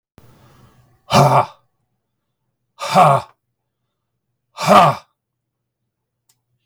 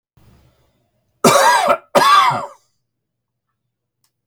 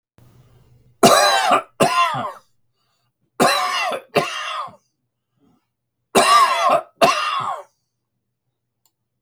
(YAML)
exhalation_length: 6.7 s
exhalation_amplitude: 32768
exhalation_signal_mean_std_ratio: 0.31
cough_length: 4.3 s
cough_amplitude: 32768
cough_signal_mean_std_ratio: 0.41
three_cough_length: 9.2 s
three_cough_amplitude: 32768
three_cough_signal_mean_std_ratio: 0.47
survey_phase: beta (2021-08-13 to 2022-03-07)
age: 65+
gender: Male
wearing_mask: 'No'
symptom_none: true
smoker_status: Ex-smoker
respiratory_condition_asthma: false
respiratory_condition_other: false
recruitment_source: REACT
submission_delay: 2 days
covid_test_result: Negative
covid_test_method: RT-qPCR
influenza_a_test_result: Unknown/Void
influenza_b_test_result: Unknown/Void